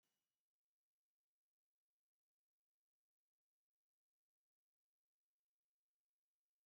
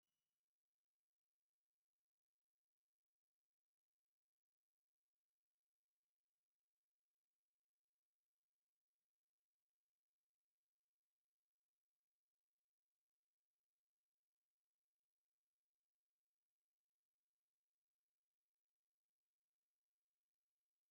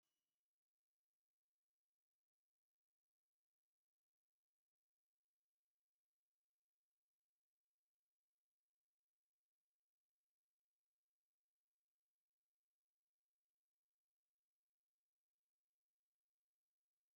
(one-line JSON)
{"cough_length": "6.7 s", "cough_amplitude": 5, "cough_signal_mean_std_ratio": 0.14, "exhalation_length": "20.9 s", "exhalation_amplitude": 2, "exhalation_signal_mean_std_ratio": 0.12, "three_cough_length": "17.2 s", "three_cough_amplitude": 3, "three_cough_signal_mean_std_ratio": 0.12, "survey_phase": "beta (2021-08-13 to 2022-03-07)", "age": "65+", "gender": "Male", "wearing_mask": "No", "symptom_none": true, "smoker_status": "Never smoked", "respiratory_condition_asthma": false, "respiratory_condition_other": false, "recruitment_source": "REACT", "submission_delay": "3 days", "covid_test_result": "Negative", "covid_test_method": "RT-qPCR", "influenza_a_test_result": "Unknown/Void", "influenza_b_test_result": "Unknown/Void"}